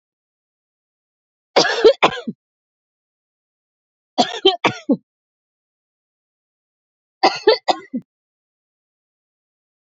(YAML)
three_cough_length: 9.9 s
three_cough_amplitude: 29439
three_cough_signal_mean_std_ratio: 0.25
survey_phase: beta (2021-08-13 to 2022-03-07)
age: 45-64
gender: Female
wearing_mask: 'No'
symptom_sore_throat: true
symptom_fatigue: true
symptom_headache: true
smoker_status: Never smoked
respiratory_condition_asthma: true
respiratory_condition_other: true
recruitment_source: REACT
submission_delay: 2 days
covid_test_result: Negative
covid_test_method: RT-qPCR